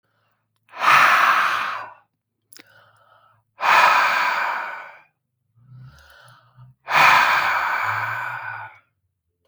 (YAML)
exhalation_length: 9.5 s
exhalation_amplitude: 29633
exhalation_signal_mean_std_ratio: 0.51
survey_phase: beta (2021-08-13 to 2022-03-07)
age: 45-64
gender: Male
wearing_mask: 'No'
symptom_none: true
symptom_onset: 12 days
smoker_status: Ex-smoker
respiratory_condition_asthma: false
respiratory_condition_other: false
recruitment_source: REACT
submission_delay: 1 day
covid_test_result: Negative
covid_test_method: RT-qPCR